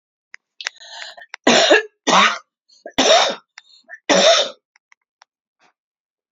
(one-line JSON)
{"three_cough_length": "6.3 s", "three_cough_amplitude": 31200, "three_cough_signal_mean_std_ratio": 0.4, "survey_phase": "beta (2021-08-13 to 2022-03-07)", "age": "65+", "gender": "Female", "wearing_mask": "No", "symptom_cough_any": true, "symptom_runny_or_blocked_nose": true, "smoker_status": "Ex-smoker", "respiratory_condition_asthma": false, "respiratory_condition_other": false, "recruitment_source": "Test and Trace", "submission_delay": "1 day", "covid_test_result": "Positive", "covid_test_method": "RT-qPCR", "covid_ct_value": 16.8, "covid_ct_gene": "ORF1ab gene", "covid_ct_mean": 17.0, "covid_viral_load": "2600000 copies/ml", "covid_viral_load_category": "High viral load (>1M copies/ml)"}